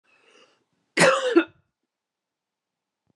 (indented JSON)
{
  "cough_length": "3.2 s",
  "cough_amplitude": 18691,
  "cough_signal_mean_std_ratio": 0.29,
  "survey_phase": "beta (2021-08-13 to 2022-03-07)",
  "age": "18-44",
  "gender": "Female",
  "wearing_mask": "No",
  "symptom_none": true,
  "smoker_status": "Ex-smoker",
  "respiratory_condition_asthma": false,
  "respiratory_condition_other": false,
  "recruitment_source": "REACT",
  "submission_delay": "2 days",
  "covid_test_result": "Negative",
  "covid_test_method": "RT-qPCR"
}